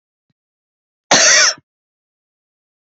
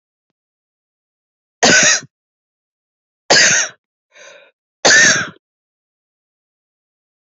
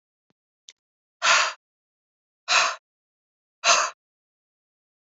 {"cough_length": "2.9 s", "cough_amplitude": 32767, "cough_signal_mean_std_ratio": 0.32, "three_cough_length": "7.3 s", "three_cough_amplitude": 31785, "three_cough_signal_mean_std_ratio": 0.33, "exhalation_length": "5.0 s", "exhalation_amplitude": 22280, "exhalation_signal_mean_std_ratio": 0.31, "survey_phase": "beta (2021-08-13 to 2022-03-07)", "age": "45-64", "gender": "Female", "wearing_mask": "No", "symptom_cough_any": true, "symptom_onset": "13 days", "smoker_status": "Never smoked", "respiratory_condition_asthma": false, "respiratory_condition_other": false, "recruitment_source": "REACT", "submission_delay": "1 day", "covid_test_result": "Negative", "covid_test_method": "RT-qPCR", "influenza_a_test_result": "Negative", "influenza_b_test_result": "Negative"}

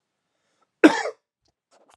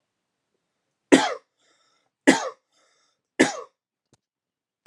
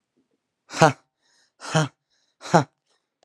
{"cough_length": "2.0 s", "cough_amplitude": 31320, "cough_signal_mean_std_ratio": 0.2, "three_cough_length": "4.9 s", "three_cough_amplitude": 30198, "three_cough_signal_mean_std_ratio": 0.22, "exhalation_length": "3.2 s", "exhalation_amplitude": 32767, "exhalation_signal_mean_std_ratio": 0.24, "survey_phase": "beta (2021-08-13 to 2022-03-07)", "age": "18-44", "gender": "Male", "wearing_mask": "No", "symptom_cough_any": true, "symptom_shortness_of_breath": true, "symptom_sore_throat": true, "symptom_fatigue": true, "symptom_fever_high_temperature": true, "symptom_headache": true, "symptom_change_to_sense_of_smell_or_taste": true, "symptom_onset": "4 days", "smoker_status": "Never smoked", "respiratory_condition_asthma": false, "respiratory_condition_other": false, "recruitment_source": "Test and Trace", "submission_delay": "1 day", "covid_test_result": "Positive", "covid_test_method": "ePCR"}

